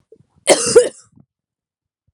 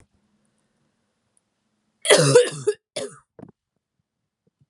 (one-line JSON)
{"cough_length": "2.1 s", "cough_amplitude": 32768, "cough_signal_mean_std_ratio": 0.3, "three_cough_length": "4.7 s", "three_cough_amplitude": 30266, "three_cough_signal_mean_std_ratio": 0.27, "survey_phase": "alpha (2021-03-01 to 2021-08-12)", "age": "18-44", "gender": "Female", "wearing_mask": "Yes", "symptom_cough_any": true, "symptom_fatigue": true, "symptom_headache": true, "symptom_loss_of_taste": true, "symptom_onset": "4 days", "smoker_status": "Never smoked", "respiratory_condition_asthma": false, "respiratory_condition_other": false, "recruitment_source": "Test and Trace", "submission_delay": "3 days", "covid_test_result": "Positive", "covid_test_method": "RT-qPCR", "covid_ct_value": 15.0, "covid_ct_gene": "N gene", "covid_ct_mean": 16.1, "covid_viral_load": "5200000 copies/ml", "covid_viral_load_category": "High viral load (>1M copies/ml)"}